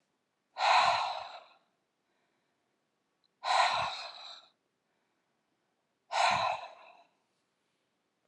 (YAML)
exhalation_length: 8.3 s
exhalation_amplitude: 7161
exhalation_signal_mean_std_ratio: 0.37
survey_phase: beta (2021-08-13 to 2022-03-07)
age: 45-64
gender: Female
wearing_mask: 'No'
symptom_none: true
smoker_status: Never smoked
respiratory_condition_asthma: false
respiratory_condition_other: false
recruitment_source: Test and Trace
submission_delay: 1 day
covid_test_result: Negative
covid_test_method: RT-qPCR